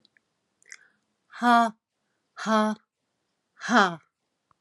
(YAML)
exhalation_length: 4.6 s
exhalation_amplitude: 16894
exhalation_signal_mean_std_ratio: 0.32
survey_phase: alpha (2021-03-01 to 2021-08-12)
age: 45-64
gender: Female
wearing_mask: 'No'
symptom_cough_any: true
symptom_fatigue: true
symptom_headache: true
symptom_onset: 3 days
smoker_status: Ex-smoker
respiratory_condition_asthma: false
respiratory_condition_other: false
recruitment_source: Test and Trace
submission_delay: 2 days
covid_test_result: Positive
covid_test_method: RT-qPCR
covid_ct_value: 21.8
covid_ct_gene: ORF1ab gene